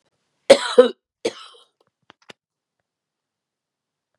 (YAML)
cough_length: 4.2 s
cough_amplitude: 32768
cough_signal_mean_std_ratio: 0.18
survey_phase: beta (2021-08-13 to 2022-03-07)
age: 65+
gender: Female
wearing_mask: 'No'
symptom_none: true
smoker_status: Ex-smoker
respiratory_condition_asthma: false
respiratory_condition_other: false
recruitment_source: REACT
submission_delay: 3 days
covid_test_result: Negative
covid_test_method: RT-qPCR
influenza_a_test_result: Negative
influenza_b_test_result: Negative